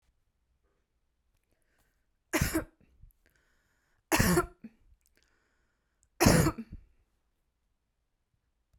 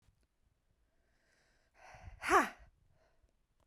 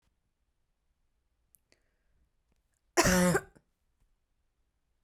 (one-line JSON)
{"three_cough_length": "8.8 s", "three_cough_amplitude": 15140, "three_cough_signal_mean_std_ratio": 0.26, "exhalation_length": "3.7 s", "exhalation_amplitude": 6225, "exhalation_signal_mean_std_ratio": 0.21, "cough_length": "5.0 s", "cough_amplitude": 12410, "cough_signal_mean_std_ratio": 0.24, "survey_phase": "beta (2021-08-13 to 2022-03-07)", "age": "18-44", "gender": "Female", "wearing_mask": "No", "symptom_fatigue": true, "symptom_onset": "12 days", "smoker_status": "Ex-smoker", "respiratory_condition_asthma": true, "respiratory_condition_other": false, "recruitment_source": "REACT", "submission_delay": "1 day", "covid_test_result": "Negative", "covid_test_method": "RT-qPCR"}